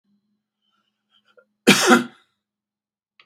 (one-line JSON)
{"cough_length": "3.3 s", "cough_amplitude": 32768, "cough_signal_mean_std_ratio": 0.25, "survey_phase": "beta (2021-08-13 to 2022-03-07)", "age": "65+", "gender": "Male", "wearing_mask": "No", "symptom_none": true, "smoker_status": "Ex-smoker", "respiratory_condition_asthma": false, "respiratory_condition_other": false, "recruitment_source": "REACT", "submission_delay": "3 days", "covid_test_result": "Negative", "covid_test_method": "RT-qPCR", "influenza_a_test_result": "Negative", "influenza_b_test_result": "Negative"}